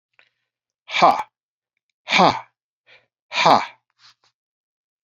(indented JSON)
{
  "exhalation_length": "5.0 s",
  "exhalation_amplitude": 29160,
  "exhalation_signal_mean_std_ratio": 0.3,
  "survey_phase": "beta (2021-08-13 to 2022-03-07)",
  "age": "45-64",
  "gender": "Male",
  "wearing_mask": "No",
  "symptom_none": true,
  "symptom_onset": "9 days",
  "smoker_status": "Never smoked",
  "respiratory_condition_asthma": false,
  "respiratory_condition_other": false,
  "recruitment_source": "Test and Trace",
  "submission_delay": "2 days",
  "covid_test_result": "Positive",
  "covid_test_method": "ePCR"
}